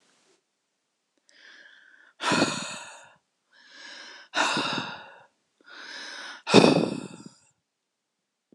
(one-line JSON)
{"exhalation_length": "8.5 s", "exhalation_amplitude": 26027, "exhalation_signal_mean_std_ratio": 0.32, "survey_phase": "alpha (2021-03-01 to 2021-08-12)", "age": "18-44", "gender": "Female", "wearing_mask": "No", "symptom_none": true, "symptom_onset": "5 days", "smoker_status": "Never smoked", "respiratory_condition_asthma": false, "respiratory_condition_other": false, "recruitment_source": "REACT", "submission_delay": "3 days", "covid_test_result": "Negative", "covid_test_method": "RT-qPCR"}